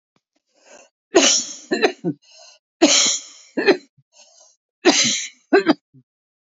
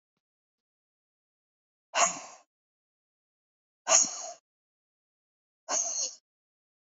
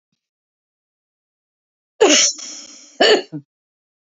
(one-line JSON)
{"three_cough_length": "6.6 s", "three_cough_amplitude": 32767, "three_cough_signal_mean_std_ratio": 0.4, "exhalation_length": "6.8 s", "exhalation_amplitude": 13029, "exhalation_signal_mean_std_ratio": 0.26, "cough_length": "4.2 s", "cough_amplitude": 31431, "cough_signal_mean_std_ratio": 0.31, "survey_phase": "beta (2021-08-13 to 2022-03-07)", "age": "65+", "gender": "Female", "wearing_mask": "No", "symptom_fatigue": true, "smoker_status": "Never smoked", "respiratory_condition_asthma": true, "respiratory_condition_other": false, "recruitment_source": "REACT", "submission_delay": "2 days", "covid_test_result": "Negative", "covid_test_method": "RT-qPCR"}